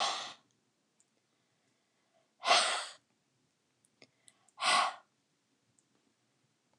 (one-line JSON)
{"exhalation_length": "6.8 s", "exhalation_amplitude": 7598, "exhalation_signal_mean_std_ratio": 0.29, "survey_phase": "beta (2021-08-13 to 2022-03-07)", "age": "65+", "gender": "Female", "wearing_mask": "No", "symptom_abdominal_pain": true, "symptom_onset": "12 days", "smoker_status": "Ex-smoker", "respiratory_condition_asthma": false, "respiratory_condition_other": false, "recruitment_source": "REACT", "submission_delay": "2 days", "covid_test_result": "Negative", "covid_test_method": "RT-qPCR", "influenza_a_test_result": "Negative", "influenza_b_test_result": "Negative"}